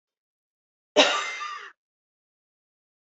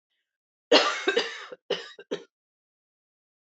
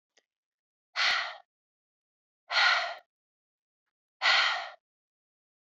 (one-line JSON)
{"cough_length": "3.1 s", "cough_amplitude": 21149, "cough_signal_mean_std_ratio": 0.27, "three_cough_length": "3.6 s", "three_cough_amplitude": 20952, "three_cough_signal_mean_std_ratio": 0.31, "exhalation_length": "5.7 s", "exhalation_amplitude": 9415, "exhalation_signal_mean_std_ratio": 0.36, "survey_phase": "beta (2021-08-13 to 2022-03-07)", "age": "45-64", "gender": "Female", "wearing_mask": "No", "symptom_cough_any": true, "symptom_new_continuous_cough": true, "symptom_runny_or_blocked_nose": true, "symptom_headache": true, "smoker_status": "Ex-smoker", "respiratory_condition_asthma": false, "respiratory_condition_other": false, "recruitment_source": "Test and Trace", "submission_delay": "1 day", "covid_test_result": "Positive", "covid_test_method": "RT-qPCR", "covid_ct_value": 21.4, "covid_ct_gene": "ORF1ab gene"}